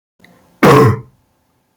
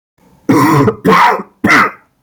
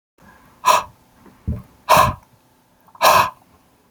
{"cough_length": "1.8 s", "cough_amplitude": 32767, "cough_signal_mean_std_ratio": 0.4, "three_cough_length": "2.2 s", "three_cough_amplitude": 32019, "three_cough_signal_mean_std_ratio": 0.68, "exhalation_length": "3.9 s", "exhalation_amplitude": 30343, "exhalation_signal_mean_std_ratio": 0.37, "survey_phase": "beta (2021-08-13 to 2022-03-07)", "age": "18-44", "gender": "Male", "wearing_mask": "No", "symptom_cough_any": true, "symptom_fatigue": true, "symptom_onset": "3 days", "smoker_status": "Never smoked", "respiratory_condition_asthma": false, "respiratory_condition_other": false, "recruitment_source": "Test and Trace", "submission_delay": "1 day", "covid_test_result": "Positive", "covid_test_method": "RT-qPCR", "covid_ct_value": 14.5, "covid_ct_gene": "ORF1ab gene", "covid_ct_mean": 15.4, "covid_viral_load": "8600000 copies/ml", "covid_viral_load_category": "High viral load (>1M copies/ml)"}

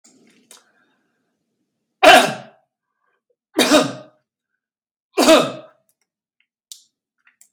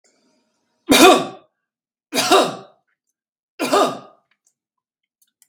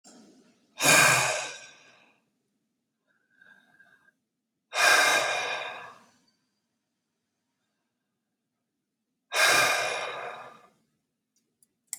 {"cough_length": "7.5 s", "cough_amplitude": 32768, "cough_signal_mean_std_ratio": 0.27, "three_cough_length": "5.5 s", "three_cough_amplitude": 32768, "three_cough_signal_mean_std_ratio": 0.33, "exhalation_length": "12.0 s", "exhalation_amplitude": 19986, "exhalation_signal_mean_std_ratio": 0.36, "survey_phase": "beta (2021-08-13 to 2022-03-07)", "age": "65+", "gender": "Male", "wearing_mask": "No", "symptom_none": true, "smoker_status": "Ex-smoker", "respiratory_condition_asthma": false, "respiratory_condition_other": false, "recruitment_source": "REACT", "submission_delay": "1 day", "covid_test_result": "Negative", "covid_test_method": "RT-qPCR"}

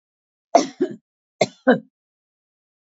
{"cough_length": "2.8 s", "cough_amplitude": 29179, "cough_signal_mean_std_ratio": 0.26, "survey_phase": "alpha (2021-03-01 to 2021-08-12)", "age": "45-64", "gender": "Female", "wearing_mask": "No", "symptom_cough_any": true, "symptom_onset": "6 days", "smoker_status": "Never smoked", "respiratory_condition_asthma": false, "respiratory_condition_other": false, "recruitment_source": "Test and Trace", "submission_delay": "2 days", "covid_test_result": "Positive", "covid_test_method": "RT-qPCR"}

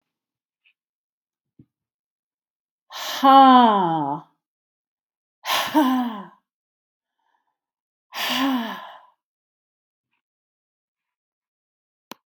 {"exhalation_length": "12.3 s", "exhalation_amplitude": 30214, "exhalation_signal_mean_std_ratio": 0.3, "survey_phase": "beta (2021-08-13 to 2022-03-07)", "age": "65+", "gender": "Female", "wearing_mask": "No", "symptom_none": true, "smoker_status": "Ex-smoker", "respiratory_condition_asthma": false, "respiratory_condition_other": false, "recruitment_source": "Test and Trace", "submission_delay": "3 days", "covid_test_result": "Negative", "covid_test_method": "RT-qPCR"}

